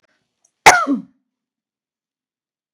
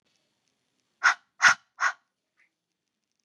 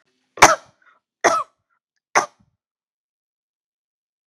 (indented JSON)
{
  "cough_length": "2.7 s",
  "cough_amplitude": 32768,
  "cough_signal_mean_std_ratio": 0.23,
  "exhalation_length": "3.2 s",
  "exhalation_amplitude": 20428,
  "exhalation_signal_mean_std_ratio": 0.24,
  "three_cough_length": "4.3 s",
  "three_cough_amplitude": 32768,
  "three_cough_signal_mean_std_ratio": 0.21,
  "survey_phase": "beta (2021-08-13 to 2022-03-07)",
  "age": "45-64",
  "gender": "Female",
  "wearing_mask": "No",
  "symptom_none": true,
  "smoker_status": "Ex-smoker",
  "respiratory_condition_asthma": false,
  "respiratory_condition_other": false,
  "recruitment_source": "REACT",
  "submission_delay": "2 days",
  "covid_test_result": "Negative",
  "covid_test_method": "RT-qPCR",
  "influenza_a_test_result": "Unknown/Void",
  "influenza_b_test_result": "Unknown/Void"
}